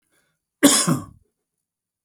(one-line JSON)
{"cough_length": "2.0 s", "cough_amplitude": 32768, "cough_signal_mean_std_ratio": 0.31, "survey_phase": "alpha (2021-03-01 to 2021-08-12)", "age": "45-64", "gender": "Male", "wearing_mask": "No", "symptom_headache": true, "smoker_status": "Never smoked", "respiratory_condition_asthma": false, "respiratory_condition_other": false, "recruitment_source": "REACT", "submission_delay": "2 days", "covid_test_result": "Negative", "covid_test_method": "RT-qPCR"}